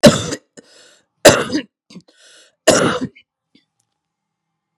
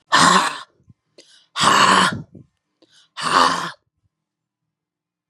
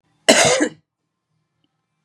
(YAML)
three_cough_length: 4.8 s
three_cough_amplitude: 32768
three_cough_signal_mean_std_ratio: 0.3
exhalation_length: 5.3 s
exhalation_amplitude: 32025
exhalation_signal_mean_std_ratio: 0.43
cough_length: 2.0 s
cough_amplitude: 32768
cough_signal_mean_std_ratio: 0.34
survey_phase: beta (2021-08-13 to 2022-03-07)
age: 45-64
gender: Female
wearing_mask: 'No'
symptom_cough_any: true
symptom_sore_throat: true
smoker_status: Never smoked
respiratory_condition_asthma: false
respiratory_condition_other: false
recruitment_source: REACT
submission_delay: 1 day
covid_test_result: Negative
covid_test_method: RT-qPCR
influenza_a_test_result: Negative
influenza_b_test_result: Negative